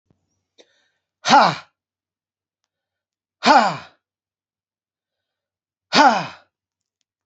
{"exhalation_length": "7.3 s", "exhalation_amplitude": 30045, "exhalation_signal_mean_std_ratio": 0.26, "survey_phase": "alpha (2021-03-01 to 2021-08-12)", "age": "65+", "gender": "Male", "wearing_mask": "No", "symptom_none": true, "smoker_status": "Ex-smoker", "respiratory_condition_asthma": false, "respiratory_condition_other": false, "recruitment_source": "REACT", "submission_delay": "1 day", "covid_test_result": "Negative", "covid_test_method": "RT-qPCR"}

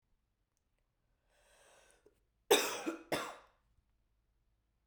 {"cough_length": "4.9 s", "cough_amplitude": 6932, "cough_signal_mean_std_ratio": 0.24, "survey_phase": "beta (2021-08-13 to 2022-03-07)", "age": "18-44", "gender": "Female", "wearing_mask": "No", "symptom_cough_any": true, "symptom_runny_or_blocked_nose": true, "symptom_sore_throat": true, "symptom_onset": "3 days", "smoker_status": "Never smoked", "respiratory_condition_asthma": false, "respiratory_condition_other": false, "recruitment_source": "Test and Trace", "submission_delay": "1 day", "covid_test_result": "Positive", "covid_test_method": "RT-qPCR", "covid_ct_value": 17.8, "covid_ct_gene": "ORF1ab gene"}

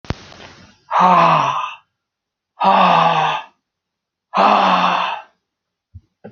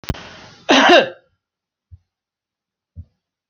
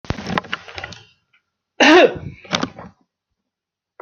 {"exhalation_length": "6.3 s", "exhalation_amplitude": 32767, "exhalation_signal_mean_std_ratio": 0.54, "cough_length": "3.5 s", "cough_amplitude": 29940, "cough_signal_mean_std_ratio": 0.29, "three_cough_length": "4.0 s", "three_cough_amplitude": 32768, "three_cough_signal_mean_std_ratio": 0.32, "survey_phase": "alpha (2021-03-01 to 2021-08-12)", "age": "45-64", "gender": "Male", "wearing_mask": "No", "symptom_none": true, "smoker_status": "Never smoked", "respiratory_condition_asthma": false, "respiratory_condition_other": false, "recruitment_source": "REACT", "submission_delay": "2 days", "covid_test_result": "Negative", "covid_test_method": "RT-qPCR"}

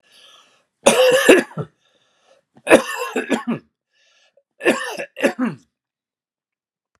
{"three_cough_length": "7.0 s", "three_cough_amplitude": 32768, "three_cough_signal_mean_std_ratio": 0.36, "survey_phase": "alpha (2021-03-01 to 2021-08-12)", "age": "65+", "gender": "Male", "wearing_mask": "No", "symptom_none": true, "smoker_status": "Ex-smoker", "respiratory_condition_asthma": false, "respiratory_condition_other": false, "recruitment_source": "REACT", "submission_delay": "2 days", "covid_test_result": "Negative", "covid_test_method": "RT-qPCR"}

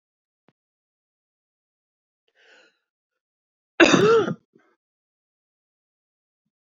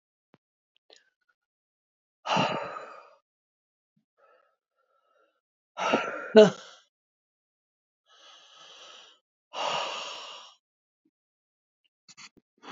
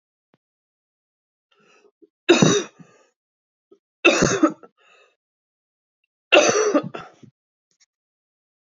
{"cough_length": "6.7 s", "cough_amplitude": 27164, "cough_signal_mean_std_ratio": 0.21, "exhalation_length": "12.7 s", "exhalation_amplitude": 26017, "exhalation_signal_mean_std_ratio": 0.21, "three_cough_length": "8.7 s", "three_cough_amplitude": 28196, "three_cough_signal_mean_std_ratio": 0.3, "survey_phase": "beta (2021-08-13 to 2022-03-07)", "age": "45-64", "gender": "Female", "wearing_mask": "No", "symptom_cough_any": true, "symptom_sore_throat": true, "symptom_abdominal_pain": true, "symptom_fatigue": true, "smoker_status": "Never smoked", "respiratory_condition_asthma": false, "respiratory_condition_other": false, "recruitment_source": "Test and Trace", "submission_delay": "2 days", "covid_test_result": "Positive", "covid_test_method": "RT-qPCR", "covid_ct_value": 14.6, "covid_ct_gene": "ORF1ab gene", "covid_ct_mean": 14.8, "covid_viral_load": "14000000 copies/ml", "covid_viral_load_category": "High viral load (>1M copies/ml)"}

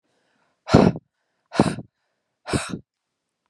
{"exhalation_length": "3.5 s", "exhalation_amplitude": 31319, "exhalation_signal_mean_std_ratio": 0.28, "survey_phase": "beta (2021-08-13 to 2022-03-07)", "age": "18-44", "gender": "Male", "wearing_mask": "No", "symptom_cough_any": true, "symptom_headache": true, "symptom_onset": "3 days", "smoker_status": "Never smoked", "respiratory_condition_asthma": false, "respiratory_condition_other": false, "recruitment_source": "Test and Trace", "submission_delay": "1 day", "covid_test_result": "Negative", "covid_test_method": "ePCR"}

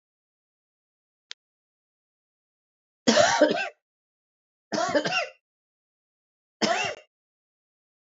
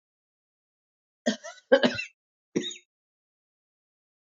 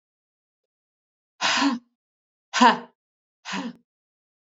{"three_cough_length": "8.0 s", "three_cough_amplitude": 19445, "three_cough_signal_mean_std_ratio": 0.31, "cough_length": "4.4 s", "cough_amplitude": 16623, "cough_signal_mean_std_ratio": 0.23, "exhalation_length": "4.4 s", "exhalation_amplitude": 26763, "exhalation_signal_mean_std_ratio": 0.29, "survey_phase": "beta (2021-08-13 to 2022-03-07)", "age": "18-44", "gender": "Female", "wearing_mask": "No", "symptom_cough_any": true, "symptom_runny_or_blocked_nose": true, "symptom_sore_throat": true, "symptom_fatigue": true, "symptom_headache": true, "symptom_onset": "3 days", "smoker_status": "Never smoked", "respiratory_condition_asthma": false, "respiratory_condition_other": false, "recruitment_source": "Test and Trace", "submission_delay": "1 day", "covid_test_result": "Positive", "covid_test_method": "RT-qPCR", "covid_ct_value": 21.8, "covid_ct_gene": "N gene"}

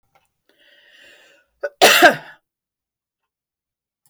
{"cough_length": "4.1 s", "cough_amplitude": 32070, "cough_signal_mean_std_ratio": 0.24, "survey_phase": "beta (2021-08-13 to 2022-03-07)", "age": "65+", "gender": "Female", "wearing_mask": "No", "symptom_none": true, "smoker_status": "Never smoked", "respiratory_condition_asthma": false, "respiratory_condition_other": false, "recruitment_source": "REACT", "submission_delay": "4 days", "covid_test_result": "Negative", "covid_test_method": "RT-qPCR"}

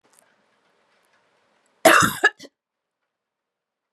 {"cough_length": "3.9 s", "cough_amplitude": 32761, "cough_signal_mean_std_ratio": 0.23, "survey_phase": "beta (2021-08-13 to 2022-03-07)", "age": "45-64", "gender": "Female", "wearing_mask": "No", "symptom_new_continuous_cough": true, "symptom_runny_or_blocked_nose": true, "symptom_shortness_of_breath": true, "symptom_fatigue": true, "symptom_headache": true, "symptom_change_to_sense_of_smell_or_taste": true, "symptom_onset": "3 days", "smoker_status": "Never smoked", "respiratory_condition_asthma": false, "respiratory_condition_other": false, "recruitment_source": "Test and Trace", "submission_delay": "1 day", "covid_test_result": "Positive", "covid_test_method": "RT-qPCR", "covid_ct_value": 21.1, "covid_ct_gene": "ORF1ab gene", "covid_ct_mean": 22.0, "covid_viral_load": "63000 copies/ml", "covid_viral_load_category": "Low viral load (10K-1M copies/ml)"}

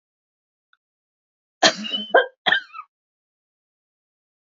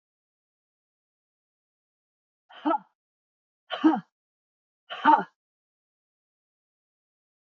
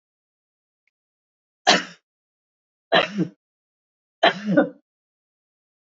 {"cough_length": "4.5 s", "cough_amplitude": 29714, "cough_signal_mean_std_ratio": 0.25, "exhalation_length": "7.4 s", "exhalation_amplitude": 15931, "exhalation_signal_mean_std_ratio": 0.2, "three_cough_length": "5.9 s", "three_cough_amplitude": 26559, "three_cough_signal_mean_std_ratio": 0.27, "survey_phase": "beta (2021-08-13 to 2022-03-07)", "age": "65+", "gender": "Female", "wearing_mask": "No", "symptom_none": true, "smoker_status": "Ex-smoker", "respiratory_condition_asthma": false, "respiratory_condition_other": false, "recruitment_source": "REACT", "submission_delay": "3 days", "covid_test_result": "Negative", "covid_test_method": "RT-qPCR"}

